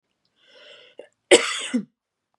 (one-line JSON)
{"cough_length": "2.4 s", "cough_amplitude": 32098, "cough_signal_mean_std_ratio": 0.26, "survey_phase": "beta (2021-08-13 to 2022-03-07)", "age": "18-44", "gender": "Female", "wearing_mask": "No", "symptom_sore_throat": true, "symptom_onset": "6 days", "smoker_status": "Never smoked", "respiratory_condition_asthma": false, "respiratory_condition_other": false, "recruitment_source": "REACT", "submission_delay": "1 day", "covid_test_result": "Negative", "covid_test_method": "RT-qPCR", "influenza_a_test_result": "Unknown/Void", "influenza_b_test_result": "Unknown/Void"}